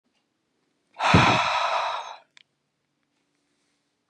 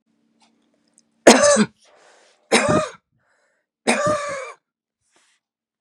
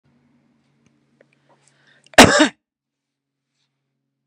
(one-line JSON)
{"exhalation_length": "4.1 s", "exhalation_amplitude": 22766, "exhalation_signal_mean_std_ratio": 0.39, "three_cough_length": "5.8 s", "three_cough_amplitude": 32768, "three_cough_signal_mean_std_ratio": 0.33, "cough_length": "4.3 s", "cough_amplitude": 32768, "cough_signal_mean_std_ratio": 0.19, "survey_phase": "beta (2021-08-13 to 2022-03-07)", "age": "45-64", "gender": "Female", "wearing_mask": "No", "symptom_none": true, "smoker_status": "Ex-smoker", "respiratory_condition_asthma": false, "respiratory_condition_other": false, "recruitment_source": "REACT", "submission_delay": "2 days", "covid_test_result": "Negative", "covid_test_method": "RT-qPCR", "influenza_a_test_result": "Negative", "influenza_b_test_result": "Negative"}